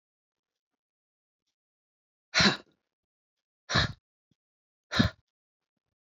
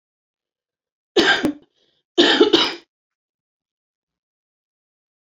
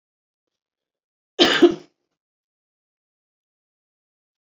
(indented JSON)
{
  "exhalation_length": "6.1 s",
  "exhalation_amplitude": 12695,
  "exhalation_signal_mean_std_ratio": 0.22,
  "three_cough_length": "5.2 s",
  "three_cough_amplitude": 29395,
  "three_cough_signal_mean_std_ratio": 0.31,
  "cough_length": "4.4 s",
  "cough_amplitude": 31386,
  "cough_signal_mean_std_ratio": 0.2,
  "survey_phase": "beta (2021-08-13 to 2022-03-07)",
  "age": "45-64",
  "gender": "Female",
  "wearing_mask": "No",
  "symptom_cough_any": true,
  "symptom_runny_or_blocked_nose": true,
  "symptom_sore_throat": true,
  "symptom_fatigue": true,
  "symptom_onset": "12 days",
  "smoker_status": "Ex-smoker",
  "respiratory_condition_asthma": false,
  "respiratory_condition_other": false,
  "recruitment_source": "REACT",
  "submission_delay": "1 day",
  "covid_test_result": "Negative",
  "covid_test_method": "RT-qPCR"
}